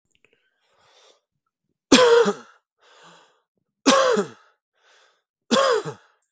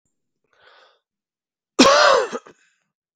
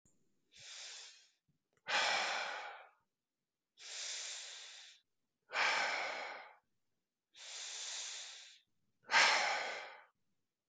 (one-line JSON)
{"three_cough_length": "6.3 s", "three_cough_amplitude": 32768, "three_cough_signal_mean_std_ratio": 0.35, "cough_length": "3.2 s", "cough_amplitude": 32768, "cough_signal_mean_std_ratio": 0.32, "exhalation_length": "10.7 s", "exhalation_amplitude": 5011, "exhalation_signal_mean_std_ratio": 0.45, "survey_phase": "beta (2021-08-13 to 2022-03-07)", "age": "18-44", "gender": "Male", "wearing_mask": "No", "symptom_sore_throat": true, "smoker_status": "Never smoked", "respiratory_condition_asthma": true, "respiratory_condition_other": false, "recruitment_source": "Test and Trace", "submission_delay": "2 days", "covid_test_result": "Positive", "covid_test_method": "RT-qPCR", "covid_ct_value": 18.8, "covid_ct_gene": "N gene", "covid_ct_mean": 19.6, "covid_viral_load": "360000 copies/ml", "covid_viral_load_category": "Low viral load (10K-1M copies/ml)"}